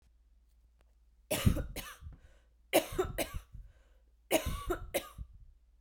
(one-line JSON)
{"three_cough_length": "5.8 s", "three_cough_amplitude": 8138, "three_cough_signal_mean_std_ratio": 0.4, "survey_phase": "beta (2021-08-13 to 2022-03-07)", "age": "18-44", "gender": "Female", "wearing_mask": "Yes", "symptom_new_continuous_cough": true, "symptom_runny_or_blocked_nose": true, "symptom_sore_throat": true, "symptom_fever_high_temperature": true, "symptom_headache": true, "symptom_loss_of_taste": true, "symptom_onset": "4 days", "smoker_status": "Never smoked", "respiratory_condition_asthma": false, "respiratory_condition_other": false, "recruitment_source": "Test and Trace", "submission_delay": "3 days", "covid_test_result": "Positive", "covid_test_method": "RT-qPCR", "covid_ct_value": 19.4, "covid_ct_gene": "ORF1ab gene", "covid_ct_mean": 20.6, "covid_viral_load": "170000 copies/ml", "covid_viral_load_category": "Low viral load (10K-1M copies/ml)"}